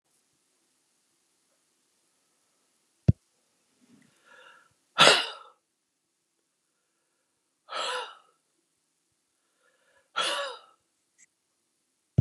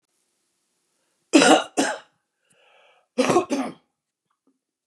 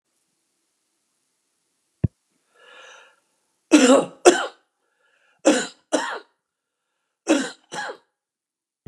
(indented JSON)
{
  "exhalation_length": "12.2 s",
  "exhalation_amplitude": 26962,
  "exhalation_signal_mean_std_ratio": 0.18,
  "cough_length": "4.9 s",
  "cough_amplitude": 27332,
  "cough_signal_mean_std_ratio": 0.31,
  "three_cough_length": "8.9 s",
  "three_cough_amplitude": 32767,
  "three_cough_signal_mean_std_ratio": 0.27,
  "survey_phase": "beta (2021-08-13 to 2022-03-07)",
  "age": "65+",
  "gender": "Male",
  "wearing_mask": "No",
  "symptom_none": true,
  "symptom_onset": "7 days",
  "smoker_status": "Ex-smoker",
  "respiratory_condition_asthma": false,
  "respiratory_condition_other": false,
  "recruitment_source": "Test and Trace",
  "submission_delay": "2 days",
  "covid_test_result": "Positive",
  "covid_test_method": "RT-qPCR",
  "covid_ct_value": 26.5,
  "covid_ct_gene": "ORF1ab gene"
}